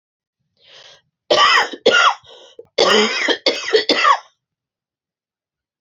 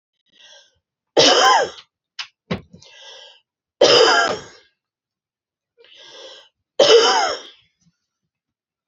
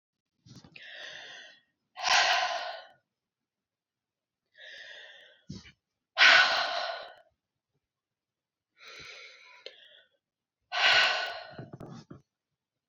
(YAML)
cough_length: 5.8 s
cough_amplitude: 29206
cough_signal_mean_std_ratio: 0.46
three_cough_length: 8.9 s
three_cough_amplitude: 31873
three_cough_signal_mean_std_ratio: 0.37
exhalation_length: 12.9 s
exhalation_amplitude: 14767
exhalation_signal_mean_std_ratio: 0.33
survey_phase: beta (2021-08-13 to 2022-03-07)
age: 45-64
gender: Female
wearing_mask: 'No'
symptom_cough_any: true
symptom_runny_or_blocked_nose: true
symptom_fatigue: true
symptom_fever_high_temperature: true
symptom_headache: true
symptom_change_to_sense_of_smell_or_taste: true
symptom_loss_of_taste: true
smoker_status: Ex-smoker
respiratory_condition_asthma: true
respiratory_condition_other: false
recruitment_source: Test and Trace
submission_delay: 2 days
covid_test_result: Positive
covid_test_method: RT-qPCR
covid_ct_value: 14.8
covid_ct_gene: ORF1ab gene
covid_ct_mean: 15.0
covid_viral_load: 12000000 copies/ml
covid_viral_load_category: High viral load (>1M copies/ml)